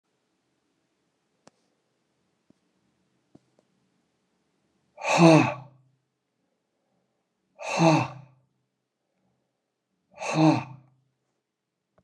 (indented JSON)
{
  "exhalation_length": "12.0 s",
  "exhalation_amplitude": 20422,
  "exhalation_signal_mean_std_ratio": 0.24,
  "survey_phase": "beta (2021-08-13 to 2022-03-07)",
  "age": "65+",
  "gender": "Male",
  "wearing_mask": "No",
  "symptom_cough_any": true,
  "symptom_sore_throat": true,
  "smoker_status": "Ex-smoker",
  "respiratory_condition_asthma": false,
  "respiratory_condition_other": false,
  "recruitment_source": "Test and Trace",
  "submission_delay": "1 day",
  "covid_test_result": "Positive",
  "covid_test_method": "RT-qPCR",
  "covid_ct_value": 18.2,
  "covid_ct_gene": "ORF1ab gene",
  "covid_ct_mean": 18.9,
  "covid_viral_load": "620000 copies/ml",
  "covid_viral_load_category": "Low viral load (10K-1M copies/ml)"
}